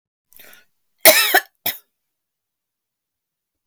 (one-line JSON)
{"cough_length": "3.7 s", "cough_amplitude": 32768, "cough_signal_mean_std_ratio": 0.24, "survey_phase": "beta (2021-08-13 to 2022-03-07)", "age": "45-64", "gender": "Female", "wearing_mask": "No", "symptom_fatigue": true, "symptom_loss_of_taste": true, "smoker_status": "Never smoked", "respiratory_condition_asthma": true, "respiratory_condition_other": false, "recruitment_source": "REACT", "submission_delay": "2 days", "covid_test_result": "Negative", "covid_test_method": "RT-qPCR"}